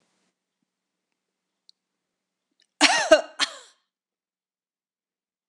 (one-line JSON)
{"cough_length": "5.5 s", "cough_amplitude": 26027, "cough_signal_mean_std_ratio": 0.2, "survey_phase": "beta (2021-08-13 to 2022-03-07)", "age": "45-64", "gender": "Female", "wearing_mask": "No", "symptom_none": true, "smoker_status": "Never smoked", "respiratory_condition_asthma": false, "respiratory_condition_other": false, "recruitment_source": "REACT", "submission_delay": "1 day", "covid_test_result": "Negative", "covid_test_method": "RT-qPCR"}